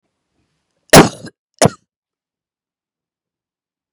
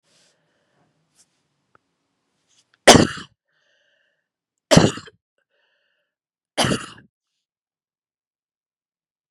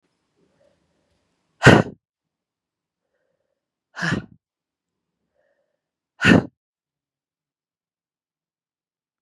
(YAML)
cough_length: 3.9 s
cough_amplitude: 32768
cough_signal_mean_std_ratio: 0.19
three_cough_length: 9.3 s
three_cough_amplitude: 32768
three_cough_signal_mean_std_ratio: 0.18
exhalation_length: 9.2 s
exhalation_amplitude: 32768
exhalation_signal_mean_std_ratio: 0.17
survey_phase: beta (2021-08-13 to 2022-03-07)
age: 45-64
gender: Female
wearing_mask: 'No'
symptom_cough_any: true
symptom_runny_or_blocked_nose: true
symptom_fatigue: true
symptom_headache: true
symptom_onset: 4 days
smoker_status: Ex-smoker
respiratory_condition_asthma: false
respiratory_condition_other: false
recruitment_source: Test and Trace
submission_delay: 2 days
covid_test_result: Positive
covid_test_method: RT-qPCR
covid_ct_value: 18.1
covid_ct_gene: ORF1ab gene
covid_ct_mean: 18.4
covid_viral_load: 940000 copies/ml
covid_viral_load_category: Low viral load (10K-1M copies/ml)